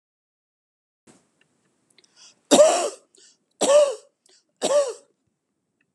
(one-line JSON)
{"three_cough_length": "5.9 s", "three_cough_amplitude": 28703, "three_cough_signal_mean_std_ratio": 0.32, "survey_phase": "beta (2021-08-13 to 2022-03-07)", "age": "65+", "gender": "Female", "wearing_mask": "No", "symptom_none": true, "smoker_status": "Never smoked", "respiratory_condition_asthma": false, "respiratory_condition_other": false, "recruitment_source": "REACT", "submission_delay": "2 days", "covid_test_result": "Negative", "covid_test_method": "RT-qPCR"}